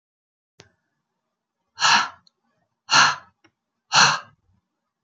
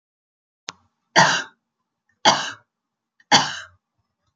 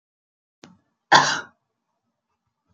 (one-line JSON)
{"exhalation_length": "5.0 s", "exhalation_amplitude": 28476, "exhalation_signal_mean_std_ratio": 0.3, "three_cough_length": "4.4 s", "three_cough_amplitude": 30571, "three_cough_signal_mean_std_ratio": 0.29, "cough_length": "2.7 s", "cough_amplitude": 30987, "cough_signal_mean_std_ratio": 0.22, "survey_phase": "alpha (2021-03-01 to 2021-08-12)", "age": "45-64", "gender": "Female", "wearing_mask": "No", "symptom_none": true, "smoker_status": "Never smoked", "respiratory_condition_asthma": false, "respiratory_condition_other": false, "recruitment_source": "REACT", "submission_delay": "3 days", "covid_test_result": "Negative", "covid_test_method": "RT-qPCR"}